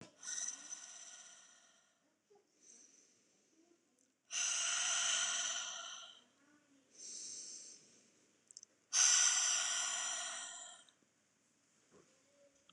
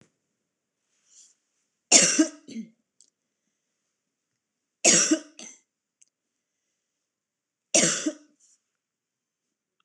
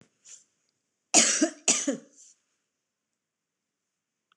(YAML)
exhalation_length: 12.7 s
exhalation_amplitude: 4751
exhalation_signal_mean_std_ratio: 0.46
three_cough_length: 9.8 s
three_cough_amplitude: 25574
three_cough_signal_mean_std_ratio: 0.25
cough_length: 4.4 s
cough_amplitude: 21821
cough_signal_mean_std_ratio: 0.28
survey_phase: beta (2021-08-13 to 2022-03-07)
age: 45-64
gender: Female
wearing_mask: 'No'
symptom_cough_any: true
symptom_runny_or_blocked_nose: true
symptom_headache: true
symptom_onset: 3 days
smoker_status: Ex-smoker
respiratory_condition_asthma: false
respiratory_condition_other: false
recruitment_source: REACT
submission_delay: 1 day
covid_test_result: Negative
covid_test_method: RT-qPCR